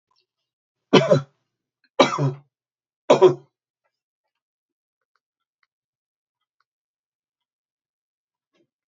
{"three_cough_length": "8.9 s", "three_cough_amplitude": 32767, "three_cough_signal_mean_std_ratio": 0.21, "survey_phase": "beta (2021-08-13 to 2022-03-07)", "age": "65+", "gender": "Male", "wearing_mask": "No", "symptom_none": true, "smoker_status": "Ex-smoker", "respiratory_condition_asthma": false, "respiratory_condition_other": false, "recruitment_source": "REACT", "submission_delay": "1 day", "covid_test_result": "Negative", "covid_test_method": "RT-qPCR"}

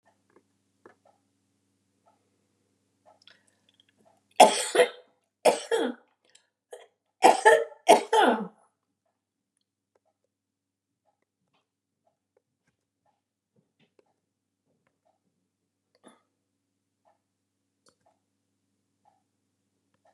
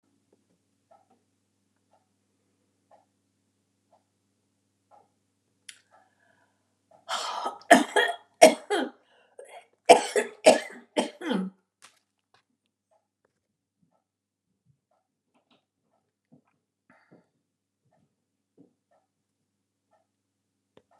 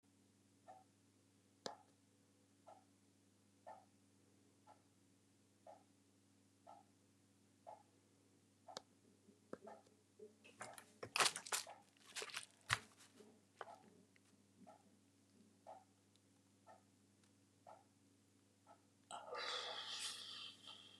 {"three_cough_length": "20.1 s", "three_cough_amplitude": 29326, "three_cough_signal_mean_std_ratio": 0.19, "cough_length": "21.0 s", "cough_amplitude": 32767, "cough_signal_mean_std_ratio": 0.18, "exhalation_length": "21.0 s", "exhalation_amplitude": 5297, "exhalation_signal_mean_std_ratio": 0.32, "survey_phase": "beta (2021-08-13 to 2022-03-07)", "age": "65+", "gender": "Female", "wearing_mask": "No", "symptom_cough_any": true, "symptom_runny_or_blocked_nose": true, "symptom_shortness_of_breath": true, "symptom_sore_throat": true, "symptom_abdominal_pain": true, "symptom_diarrhoea": true, "symptom_fatigue": true, "smoker_status": "Ex-smoker", "respiratory_condition_asthma": true, "respiratory_condition_other": true, "recruitment_source": "REACT", "submission_delay": "2 days", "covid_test_result": "Negative", "covid_test_method": "RT-qPCR"}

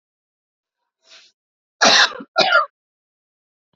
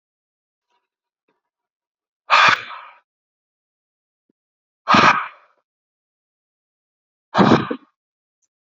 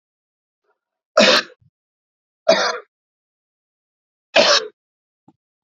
{"cough_length": "3.8 s", "cough_amplitude": 32768, "cough_signal_mean_std_ratio": 0.31, "exhalation_length": "8.8 s", "exhalation_amplitude": 29647, "exhalation_signal_mean_std_ratio": 0.26, "three_cough_length": "5.6 s", "three_cough_amplitude": 31105, "three_cough_signal_mean_std_ratio": 0.29, "survey_phase": "beta (2021-08-13 to 2022-03-07)", "age": "45-64", "gender": "Male", "wearing_mask": "No", "symptom_none": true, "symptom_onset": "4 days", "smoker_status": "Never smoked", "respiratory_condition_asthma": false, "respiratory_condition_other": false, "recruitment_source": "REACT", "submission_delay": "4 days", "covid_test_result": "Negative", "covid_test_method": "RT-qPCR"}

